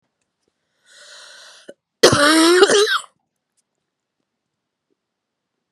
{"cough_length": "5.7 s", "cough_amplitude": 32768, "cough_signal_mean_std_ratio": 0.34, "survey_phase": "beta (2021-08-13 to 2022-03-07)", "age": "45-64", "gender": "Female", "wearing_mask": "No", "symptom_cough_any": true, "symptom_runny_or_blocked_nose": true, "symptom_fatigue": true, "symptom_fever_high_temperature": true, "symptom_headache": true, "symptom_change_to_sense_of_smell_or_taste": true, "symptom_loss_of_taste": true, "symptom_other": true, "smoker_status": "Never smoked", "respiratory_condition_asthma": false, "respiratory_condition_other": false, "recruitment_source": "Test and Trace", "submission_delay": "2 days", "covid_test_result": "Positive", "covid_test_method": "RT-qPCR", "covid_ct_value": 19.3, "covid_ct_gene": "N gene"}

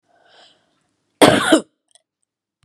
{"cough_length": "2.6 s", "cough_amplitude": 32768, "cough_signal_mean_std_ratio": 0.28, "survey_phase": "beta (2021-08-13 to 2022-03-07)", "age": "45-64", "gender": "Female", "wearing_mask": "No", "symptom_runny_or_blocked_nose": true, "symptom_fatigue": true, "symptom_onset": "12 days", "smoker_status": "Never smoked", "respiratory_condition_asthma": false, "respiratory_condition_other": false, "recruitment_source": "REACT", "submission_delay": "1 day", "covid_test_result": "Negative", "covid_test_method": "RT-qPCR", "influenza_a_test_result": "Negative", "influenza_b_test_result": "Negative"}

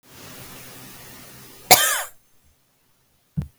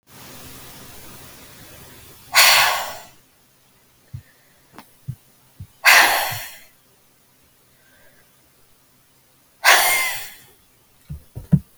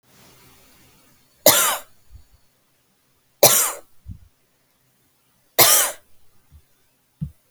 {"cough_length": "3.6 s", "cough_amplitude": 32768, "cough_signal_mean_std_ratio": 0.27, "exhalation_length": "11.8 s", "exhalation_amplitude": 32768, "exhalation_signal_mean_std_ratio": 0.32, "three_cough_length": "7.5 s", "three_cough_amplitude": 32768, "three_cough_signal_mean_std_ratio": 0.28, "survey_phase": "beta (2021-08-13 to 2022-03-07)", "age": "18-44", "gender": "Female", "wearing_mask": "No", "symptom_cough_any": true, "symptom_diarrhoea": true, "symptom_headache": true, "symptom_onset": "8 days", "smoker_status": "Ex-smoker", "respiratory_condition_asthma": false, "respiratory_condition_other": false, "recruitment_source": "REACT", "submission_delay": "2 days", "covid_test_result": "Negative", "covid_test_method": "RT-qPCR", "influenza_a_test_result": "Negative", "influenza_b_test_result": "Negative"}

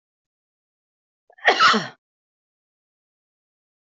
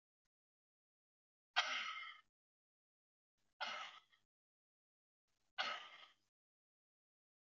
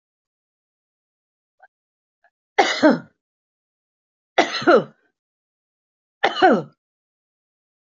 {"cough_length": "3.9 s", "cough_amplitude": 25174, "cough_signal_mean_std_ratio": 0.24, "exhalation_length": "7.4 s", "exhalation_amplitude": 3072, "exhalation_signal_mean_std_ratio": 0.28, "three_cough_length": "7.9 s", "three_cough_amplitude": 28303, "three_cough_signal_mean_std_ratio": 0.26, "survey_phase": "beta (2021-08-13 to 2022-03-07)", "age": "65+", "gender": "Female", "wearing_mask": "No", "symptom_none": true, "smoker_status": "Never smoked", "respiratory_condition_asthma": false, "respiratory_condition_other": false, "recruitment_source": "REACT", "submission_delay": "3 days", "covid_test_result": "Negative", "covid_test_method": "RT-qPCR"}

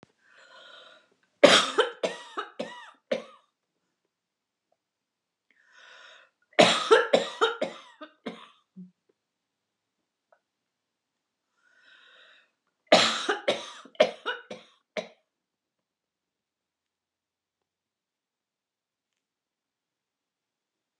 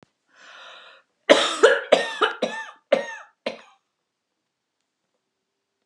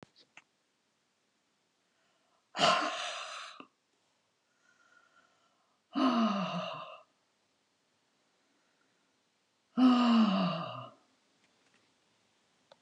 {"three_cough_length": "21.0 s", "three_cough_amplitude": 29866, "three_cough_signal_mean_std_ratio": 0.23, "cough_length": "5.9 s", "cough_amplitude": 30686, "cough_signal_mean_std_ratio": 0.31, "exhalation_length": "12.8 s", "exhalation_amplitude": 7162, "exhalation_signal_mean_std_ratio": 0.35, "survey_phase": "beta (2021-08-13 to 2022-03-07)", "age": "65+", "gender": "Female", "wearing_mask": "No", "symptom_none": true, "smoker_status": "Never smoked", "respiratory_condition_asthma": false, "respiratory_condition_other": false, "recruitment_source": "Test and Trace", "submission_delay": "0 days", "covid_test_result": "Negative", "covid_test_method": "LFT"}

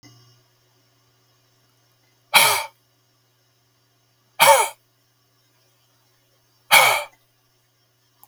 {"exhalation_length": "8.3 s", "exhalation_amplitude": 32768, "exhalation_signal_mean_std_ratio": 0.25, "survey_phase": "beta (2021-08-13 to 2022-03-07)", "age": "65+", "gender": "Male", "wearing_mask": "No", "symptom_none": true, "smoker_status": "Ex-smoker", "respiratory_condition_asthma": false, "respiratory_condition_other": false, "recruitment_source": "REACT", "submission_delay": "3 days", "covid_test_result": "Negative", "covid_test_method": "RT-qPCR", "influenza_a_test_result": "Negative", "influenza_b_test_result": "Negative"}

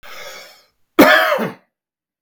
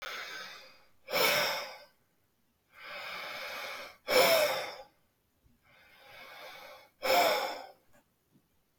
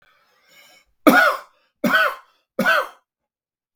{"cough_length": "2.2 s", "cough_amplitude": 32768, "cough_signal_mean_std_ratio": 0.39, "exhalation_length": "8.8 s", "exhalation_amplitude": 9237, "exhalation_signal_mean_std_ratio": 0.44, "three_cough_length": "3.8 s", "three_cough_amplitude": 32768, "three_cough_signal_mean_std_ratio": 0.38, "survey_phase": "beta (2021-08-13 to 2022-03-07)", "age": "45-64", "gender": "Male", "wearing_mask": "No", "symptom_none": true, "smoker_status": "Never smoked", "respiratory_condition_asthma": false, "respiratory_condition_other": false, "recruitment_source": "REACT", "submission_delay": "1 day", "covid_test_result": "Negative", "covid_test_method": "RT-qPCR"}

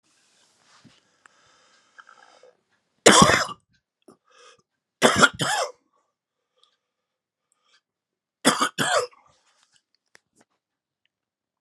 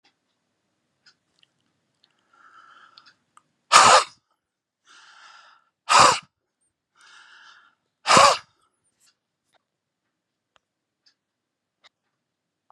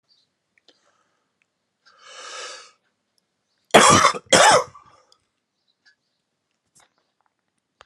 {"three_cough_length": "11.6 s", "three_cough_amplitude": 32768, "three_cough_signal_mean_std_ratio": 0.25, "exhalation_length": "12.7 s", "exhalation_amplitude": 32768, "exhalation_signal_mean_std_ratio": 0.21, "cough_length": "7.9 s", "cough_amplitude": 32767, "cough_signal_mean_std_ratio": 0.25, "survey_phase": "alpha (2021-03-01 to 2021-08-12)", "age": "45-64", "gender": "Male", "wearing_mask": "No", "symptom_cough_any": true, "symptom_new_continuous_cough": true, "symptom_fatigue": true, "symptom_fever_high_temperature": true, "symptom_headache": true, "symptom_change_to_sense_of_smell_or_taste": true, "symptom_loss_of_taste": true, "symptom_onset": "4 days", "smoker_status": "Ex-smoker", "respiratory_condition_asthma": false, "respiratory_condition_other": false, "recruitment_source": "Test and Trace", "submission_delay": "1 day", "covid_test_result": "Positive", "covid_test_method": "RT-qPCR"}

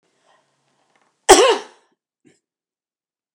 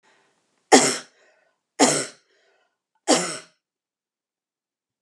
{"cough_length": "3.3 s", "cough_amplitude": 32768, "cough_signal_mean_std_ratio": 0.22, "three_cough_length": "5.0 s", "three_cough_amplitude": 32505, "three_cough_signal_mean_std_ratio": 0.27, "survey_phase": "beta (2021-08-13 to 2022-03-07)", "age": "65+", "gender": "Female", "wearing_mask": "No", "symptom_none": true, "smoker_status": "Never smoked", "respiratory_condition_asthma": false, "respiratory_condition_other": false, "recruitment_source": "REACT", "submission_delay": "12 days", "covid_test_result": "Negative", "covid_test_method": "RT-qPCR"}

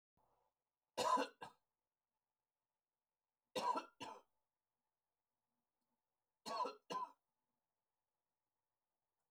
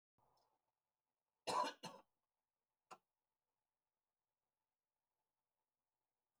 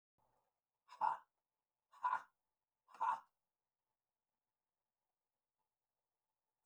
{"three_cough_length": "9.3 s", "three_cough_amplitude": 1504, "three_cough_signal_mean_std_ratio": 0.27, "cough_length": "6.4 s", "cough_amplitude": 1082, "cough_signal_mean_std_ratio": 0.18, "exhalation_length": "6.7 s", "exhalation_amplitude": 1848, "exhalation_signal_mean_std_ratio": 0.22, "survey_phase": "beta (2021-08-13 to 2022-03-07)", "age": "65+", "gender": "Male", "wearing_mask": "No", "symptom_none": true, "smoker_status": "Prefer not to say", "respiratory_condition_asthma": false, "respiratory_condition_other": false, "recruitment_source": "REACT", "submission_delay": "4 days", "covid_test_result": "Negative", "covid_test_method": "RT-qPCR", "influenza_a_test_result": "Negative", "influenza_b_test_result": "Negative"}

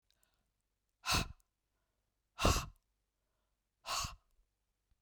{"exhalation_length": "5.0 s", "exhalation_amplitude": 4231, "exhalation_signal_mean_std_ratio": 0.28, "survey_phase": "beta (2021-08-13 to 2022-03-07)", "age": "45-64", "gender": "Female", "wearing_mask": "No", "symptom_cough_any": true, "symptom_runny_or_blocked_nose": true, "symptom_fatigue": true, "symptom_other": true, "smoker_status": "Never smoked", "respiratory_condition_asthma": false, "respiratory_condition_other": false, "recruitment_source": "Test and Trace", "submission_delay": "2 days", "covid_test_result": "Positive", "covid_test_method": "RT-qPCR"}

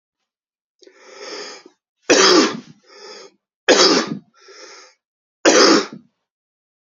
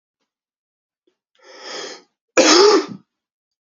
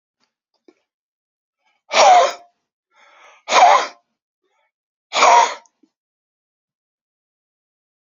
{"three_cough_length": "6.9 s", "three_cough_amplitude": 32310, "three_cough_signal_mean_std_ratio": 0.37, "cough_length": "3.8 s", "cough_amplitude": 30581, "cough_signal_mean_std_ratio": 0.32, "exhalation_length": "8.1 s", "exhalation_amplitude": 32768, "exhalation_signal_mean_std_ratio": 0.3, "survey_phase": "beta (2021-08-13 to 2022-03-07)", "age": "18-44", "gender": "Male", "wearing_mask": "No", "symptom_cough_any": true, "symptom_fatigue": true, "symptom_headache": true, "symptom_change_to_sense_of_smell_or_taste": true, "symptom_loss_of_taste": true, "symptom_onset": "5 days", "smoker_status": "Ex-smoker", "respiratory_condition_asthma": false, "respiratory_condition_other": false, "recruitment_source": "Test and Trace", "submission_delay": "2 days", "covid_test_result": "Positive", "covid_test_method": "RT-qPCR", "covid_ct_value": 22.7, "covid_ct_gene": "N gene"}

